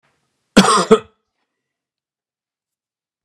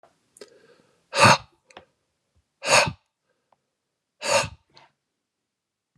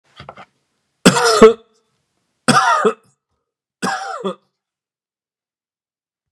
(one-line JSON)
{"cough_length": "3.2 s", "cough_amplitude": 32768, "cough_signal_mean_std_ratio": 0.25, "exhalation_length": "6.0 s", "exhalation_amplitude": 28254, "exhalation_signal_mean_std_ratio": 0.25, "three_cough_length": "6.3 s", "three_cough_amplitude": 32768, "three_cough_signal_mean_std_ratio": 0.32, "survey_phase": "beta (2021-08-13 to 2022-03-07)", "age": "45-64", "gender": "Male", "wearing_mask": "No", "symptom_none": true, "smoker_status": "Never smoked", "respiratory_condition_asthma": false, "respiratory_condition_other": false, "recruitment_source": "REACT", "submission_delay": "2 days", "covid_test_result": "Negative", "covid_test_method": "RT-qPCR", "influenza_a_test_result": "Negative", "influenza_b_test_result": "Negative"}